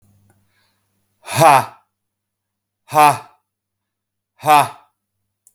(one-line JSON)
{"exhalation_length": "5.5 s", "exhalation_amplitude": 32768, "exhalation_signal_mean_std_ratio": 0.29, "survey_phase": "beta (2021-08-13 to 2022-03-07)", "age": "45-64", "gender": "Male", "wearing_mask": "No", "symptom_none": true, "smoker_status": "Ex-smoker", "respiratory_condition_asthma": false, "respiratory_condition_other": false, "recruitment_source": "REACT", "submission_delay": "2 days", "covid_test_result": "Negative", "covid_test_method": "RT-qPCR", "influenza_a_test_result": "Unknown/Void", "influenza_b_test_result": "Unknown/Void"}